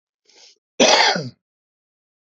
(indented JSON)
{
  "cough_length": "2.4 s",
  "cough_amplitude": 28082,
  "cough_signal_mean_std_ratio": 0.34,
  "survey_phase": "beta (2021-08-13 to 2022-03-07)",
  "age": "45-64",
  "gender": "Male",
  "wearing_mask": "No",
  "symptom_none": true,
  "smoker_status": "Ex-smoker",
  "respiratory_condition_asthma": false,
  "respiratory_condition_other": false,
  "recruitment_source": "REACT",
  "submission_delay": "1 day",
  "covid_test_result": "Negative",
  "covid_test_method": "RT-qPCR",
  "influenza_a_test_result": "Negative",
  "influenza_b_test_result": "Negative"
}